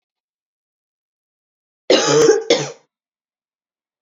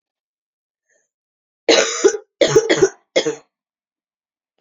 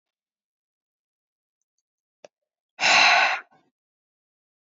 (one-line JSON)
{"cough_length": "4.0 s", "cough_amplitude": 28383, "cough_signal_mean_std_ratio": 0.33, "three_cough_length": "4.6 s", "three_cough_amplitude": 32767, "three_cough_signal_mean_std_ratio": 0.35, "exhalation_length": "4.6 s", "exhalation_amplitude": 20244, "exhalation_signal_mean_std_ratio": 0.28, "survey_phase": "beta (2021-08-13 to 2022-03-07)", "age": "18-44", "gender": "Female", "wearing_mask": "No", "symptom_cough_any": true, "symptom_new_continuous_cough": true, "symptom_runny_or_blocked_nose": true, "symptom_sore_throat": true, "symptom_fatigue": true, "symptom_fever_high_temperature": true, "symptom_headache": true, "smoker_status": "Ex-smoker", "respiratory_condition_asthma": false, "respiratory_condition_other": false, "recruitment_source": "Test and Trace", "submission_delay": "2 days", "covid_test_result": "Positive", "covid_test_method": "RT-qPCR", "covid_ct_value": 16.5, "covid_ct_gene": "ORF1ab gene", "covid_ct_mean": 16.7, "covid_viral_load": "3200000 copies/ml", "covid_viral_load_category": "High viral load (>1M copies/ml)"}